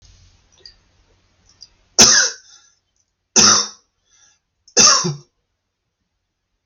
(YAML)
three_cough_length: 6.7 s
three_cough_amplitude: 32768
three_cough_signal_mean_std_ratio: 0.3
survey_phase: alpha (2021-03-01 to 2021-08-12)
age: 45-64
gender: Male
wearing_mask: 'No'
symptom_none: true
smoker_status: Ex-smoker
respiratory_condition_asthma: false
respiratory_condition_other: false
recruitment_source: REACT
submission_delay: 1 day
covid_test_result: Negative
covid_test_method: RT-qPCR